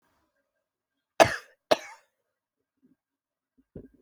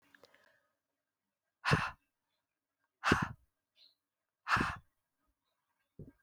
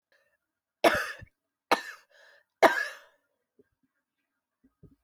cough_length: 4.0 s
cough_amplitude: 26667
cough_signal_mean_std_ratio: 0.15
exhalation_length: 6.2 s
exhalation_amplitude: 8161
exhalation_signal_mean_std_ratio: 0.26
three_cough_length: 5.0 s
three_cough_amplitude: 19900
three_cough_signal_mean_std_ratio: 0.23
survey_phase: alpha (2021-03-01 to 2021-08-12)
age: 65+
gender: Female
wearing_mask: 'No'
symptom_cough_any: true
symptom_fatigue: true
symptom_headache: true
symptom_change_to_sense_of_smell_or_taste: true
symptom_loss_of_taste: true
smoker_status: Prefer not to say
respiratory_condition_asthma: false
respiratory_condition_other: false
recruitment_source: Test and Trace
submission_delay: 2 days
covid_test_result: Positive
covid_test_method: RT-qPCR
covid_ct_value: 24.6
covid_ct_gene: ORF1ab gene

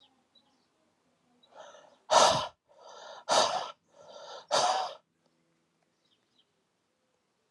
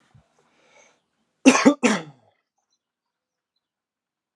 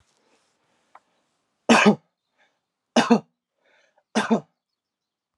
exhalation_length: 7.5 s
exhalation_amplitude: 13193
exhalation_signal_mean_std_ratio: 0.31
cough_length: 4.4 s
cough_amplitude: 32376
cough_signal_mean_std_ratio: 0.22
three_cough_length: 5.4 s
three_cough_amplitude: 25100
three_cough_signal_mean_std_ratio: 0.26
survey_phase: alpha (2021-03-01 to 2021-08-12)
age: 18-44
gender: Male
wearing_mask: 'No'
symptom_cough_any: true
symptom_change_to_sense_of_smell_or_taste: true
symptom_onset: 3 days
smoker_status: Never smoked
respiratory_condition_asthma: false
respiratory_condition_other: false
recruitment_source: Test and Trace
submission_delay: 2 days
covid_test_result: Positive
covid_test_method: RT-qPCR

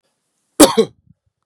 three_cough_length: 1.5 s
three_cough_amplitude: 32768
three_cough_signal_mean_std_ratio: 0.28
survey_phase: beta (2021-08-13 to 2022-03-07)
age: 45-64
gender: Male
wearing_mask: 'No'
symptom_none: true
smoker_status: Never smoked
respiratory_condition_asthma: false
respiratory_condition_other: false
recruitment_source: REACT
submission_delay: 0 days
covid_test_result: Negative
covid_test_method: RT-qPCR
influenza_a_test_result: Negative
influenza_b_test_result: Negative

